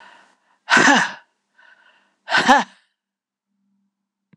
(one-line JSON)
{"exhalation_length": "4.4 s", "exhalation_amplitude": 26028, "exhalation_signal_mean_std_ratio": 0.32, "survey_phase": "beta (2021-08-13 to 2022-03-07)", "age": "45-64", "gender": "Female", "wearing_mask": "No", "symptom_none": true, "smoker_status": "Ex-smoker", "respiratory_condition_asthma": false, "respiratory_condition_other": false, "recruitment_source": "REACT", "submission_delay": "11 days", "covid_test_result": "Negative", "covid_test_method": "RT-qPCR", "influenza_a_test_result": "Unknown/Void", "influenza_b_test_result": "Unknown/Void"}